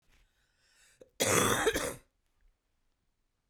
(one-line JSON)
{"cough_length": "3.5 s", "cough_amplitude": 10717, "cough_signal_mean_std_ratio": 0.36, "survey_phase": "beta (2021-08-13 to 2022-03-07)", "age": "45-64", "gender": "Female", "wearing_mask": "No", "symptom_cough_any": true, "symptom_sore_throat": true, "symptom_abdominal_pain": true, "symptom_fatigue": true, "smoker_status": "Never smoked", "respiratory_condition_asthma": false, "respiratory_condition_other": false, "recruitment_source": "Test and Trace", "submission_delay": "1 day", "covid_test_result": "Positive", "covid_test_method": "LFT"}